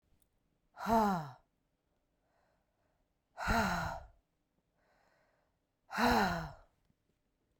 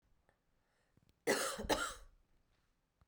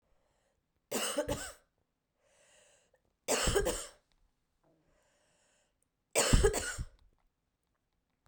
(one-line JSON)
{"exhalation_length": "7.6 s", "exhalation_amplitude": 4111, "exhalation_signal_mean_std_ratio": 0.37, "cough_length": "3.1 s", "cough_amplitude": 4766, "cough_signal_mean_std_ratio": 0.35, "three_cough_length": "8.3 s", "three_cough_amplitude": 8062, "three_cough_signal_mean_std_ratio": 0.33, "survey_phase": "beta (2021-08-13 to 2022-03-07)", "age": "45-64", "gender": "Female", "wearing_mask": "No", "symptom_cough_any": true, "symptom_runny_or_blocked_nose": true, "symptom_sore_throat": true, "symptom_fatigue": true, "symptom_headache": true, "smoker_status": "Ex-smoker", "respiratory_condition_asthma": false, "respiratory_condition_other": false, "recruitment_source": "Test and Trace", "submission_delay": "1 day", "covid_test_result": "Positive", "covid_test_method": "RT-qPCR", "covid_ct_value": 20.0, "covid_ct_gene": "ORF1ab gene", "covid_ct_mean": 20.5, "covid_viral_load": "190000 copies/ml", "covid_viral_load_category": "Low viral load (10K-1M copies/ml)"}